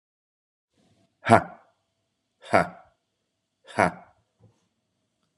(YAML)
exhalation_length: 5.4 s
exhalation_amplitude: 32767
exhalation_signal_mean_std_ratio: 0.19
survey_phase: alpha (2021-03-01 to 2021-08-12)
age: 45-64
gender: Male
wearing_mask: 'No'
symptom_cough_any: true
symptom_new_continuous_cough: true
symptom_fatigue: true
symptom_headache: true
symptom_change_to_sense_of_smell_or_taste: true
symptom_onset: 4 days
smoker_status: Ex-smoker
respiratory_condition_asthma: false
respiratory_condition_other: false
recruitment_source: Test and Trace
submission_delay: 2 days
covid_test_result: Positive
covid_test_method: RT-qPCR
covid_ct_value: 15.8
covid_ct_gene: ORF1ab gene
covid_ct_mean: 16.2
covid_viral_load: 4800000 copies/ml
covid_viral_load_category: High viral load (>1M copies/ml)